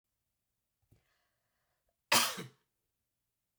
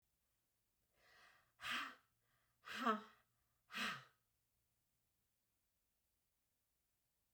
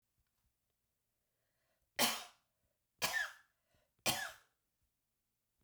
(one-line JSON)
{"cough_length": "3.6 s", "cough_amplitude": 9349, "cough_signal_mean_std_ratio": 0.2, "exhalation_length": "7.3 s", "exhalation_amplitude": 1414, "exhalation_signal_mean_std_ratio": 0.27, "three_cough_length": "5.6 s", "three_cough_amplitude": 4226, "three_cough_signal_mean_std_ratio": 0.27, "survey_phase": "beta (2021-08-13 to 2022-03-07)", "age": "65+", "gender": "Female", "wearing_mask": "No", "symptom_none": true, "smoker_status": "Never smoked", "respiratory_condition_asthma": false, "respiratory_condition_other": false, "recruitment_source": "REACT", "submission_delay": "1 day", "covid_test_result": "Negative", "covid_test_method": "RT-qPCR", "influenza_a_test_result": "Negative", "influenza_b_test_result": "Negative"}